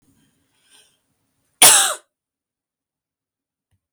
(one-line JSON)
{"cough_length": "3.9 s", "cough_amplitude": 32646, "cough_signal_mean_std_ratio": 0.22, "survey_phase": "beta (2021-08-13 to 2022-03-07)", "age": "18-44", "gender": "Female", "wearing_mask": "No", "symptom_sore_throat": true, "symptom_onset": "1 day", "smoker_status": "Ex-smoker", "respiratory_condition_asthma": false, "respiratory_condition_other": false, "recruitment_source": "Test and Trace", "submission_delay": "1 day", "covid_test_result": "Negative", "covid_test_method": "RT-qPCR"}